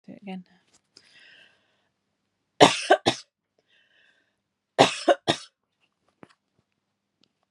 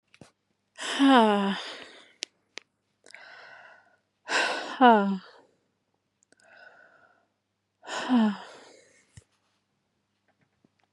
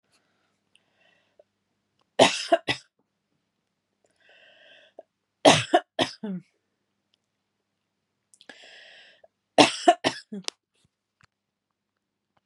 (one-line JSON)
{"cough_length": "7.5 s", "cough_amplitude": 32767, "cough_signal_mean_std_ratio": 0.21, "exhalation_length": "10.9 s", "exhalation_amplitude": 18267, "exhalation_signal_mean_std_ratio": 0.32, "three_cough_length": "12.5 s", "three_cough_amplitude": 31125, "three_cough_signal_mean_std_ratio": 0.21, "survey_phase": "beta (2021-08-13 to 2022-03-07)", "age": "18-44", "gender": "Female", "wearing_mask": "No", "symptom_cough_any": true, "symptom_fatigue": true, "symptom_other": true, "symptom_onset": "5 days", "smoker_status": "Never smoked", "respiratory_condition_asthma": false, "respiratory_condition_other": false, "recruitment_source": "Test and Trace", "submission_delay": "4 days", "covid_test_result": "Positive", "covid_test_method": "ePCR"}